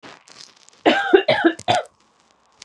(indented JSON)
{
  "cough_length": "2.6 s",
  "cough_amplitude": 31742,
  "cough_signal_mean_std_ratio": 0.41,
  "survey_phase": "beta (2021-08-13 to 2022-03-07)",
  "age": "18-44",
  "gender": "Female",
  "wearing_mask": "No",
  "symptom_none": true,
  "symptom_onset": "13 days",
  "smoker_status": "Never smoked",
  "respiratory_condition_asthma": false,
  "respiratory_condition_other": false,
  "recruitment_source": "REACT",
  "submission_delay": "1 day",
  "covid_test_result": "Negative",
  "covid_test_method": "RT-qPCR",
  "influenza_a_test_result": "Negative",
  "influenza_b_test_result": "Negative"
}